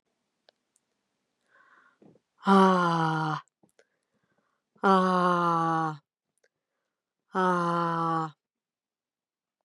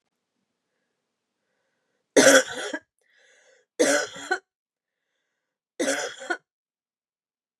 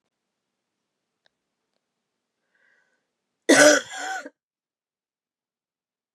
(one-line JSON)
{"exhalation_length": "9.6 s", "exhalation_amplitude": 11847, "exhalation_signal_mean_std_ratio": 0.43, "three_cough_length": "7.6 s", "three_cough_amplitude": 27817, "three_cough_signal_mean_std_ratio": 0.27, "cough_length": "6.1 s", "cough_amplitude": 28264, "cough_signal_mean_std_ratio": 0.2, "survey_phase": "beta (2021-08-13 to 2022-03-07)", "age": "45-64", "gender": "Female", "wearing_mask": "No", "symptom_cough_any": true, "symptom_new_continuous_cough": true, "symptom_sore_throat": true, "symptom_onset": "3 days", "smoker_status": "Ex-smoker", "respiratory_condition_asthma": false, "respiratory_condition_other": false, "recruitment_source": "Test and Trace", "submission_delay": "1 day", "covid_test_result": "Negative", "covid_test_method": "RT-qPCR"}